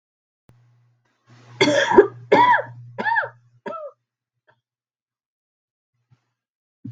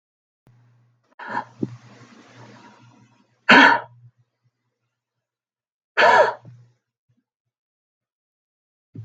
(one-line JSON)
{"cough_length": "6.9 s", "cough_amplitude": 32768, "cough_signal_mean_std_ratio": 0.31, "exhalation_length": "9.0 s", "exhalation_amplitude": 32768, "exhalation_signal_mean_std_ratio": 0.24, "survey_phase": "beta (2021-08-13 to 2022-03-07)", "age": "18-44", "gender": "Female", "wearing_mask": "No", "symptom_cough_any": true, "symptom_runny_or_blocked_nose": true, "symptom_sore_throat": true, "symptom_fatigue": true, "symptom_headache": true, "symptom_onset": "6 days", "smoker_status": "Ex-smoker", "respiratory_condition_asthma": false, "respiratory_condition_other": false, "recruitment_source": "REACT", "submission_delay": "1 day", "covid_test_result": "Negative", "covid_test_method": "RT-qPCR", "influenza_a_test_result": "Negative", "influenza_b_test_result": "Negative"}